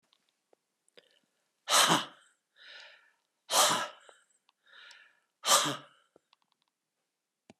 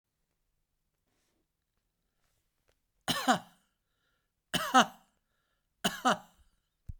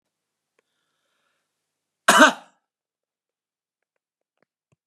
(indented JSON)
{
  "exhalation_length": "7.6 s",
  "exhalation_amplitude": 11020,
  "exhalation_signal_mean_std_ratio": 0.29,
  "three_cough_length": "7.0 s",
  "three_cough_amplitude": 10732,
  "three_cough_signal_mean_std_ratio": 0.23,
  "cough_length": "4.9 s",
  "cough_amplitude": 32385,
  "cough_signal_mean_std_ratio": 0.17,
  "survey_phase": "beta (2021-08-13 to 2022-03-07)",
  "age": "65+",
  "gender": "Male",
  "wearing_mask": "No",
  "symptom_runny_or_blocked_nose": true,
  "smoker_status": "Never smoked",
  "respiratory_condition_asthma": false,
  "respiratory_condition_other": false,
  "recruitment_source": "REACT",
  "submission_delay": "3 days",
  "covid_test_result": "Negative",
  "covid_test_method": "RT-qPCR"
}